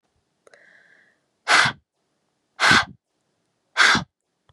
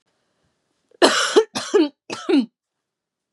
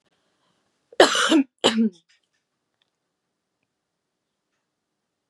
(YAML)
exhalation_length: 4.5 s
exhalation_amplitude: 27648
exhalation_signal_mean_std_ratio: 0.32
three_cough_length: 3.3 s
three_cough_amplitude: 32767
three_cough_signal_mean_std_ratio: 0.4
cough_length: 5.3 s
cough_amplitude: 31834
cough_signal_mean_std_ratio: 0.26
survey_phase: beta (2021-08-13 to 2022-03-07)
age: 18-44
gender: Female
wearing_mask: 'No'
symptom_cough_any: true
symptom_sore_throat: true
symptom_fatigue: true
symptom_headache: true
symptom_other: true
symptom_onset: 4 days
smoker_status: Never smoked
respiratory_condition_asthma: false
respiratory_condition_other: false
recruitment_source: Test and Trace
submission_delay: 1 day
covid_test_result: Positive
covid_test_method: RT-qPCR
covid_ct_value: 27.1
covid_ct_gene: ORF1ab gene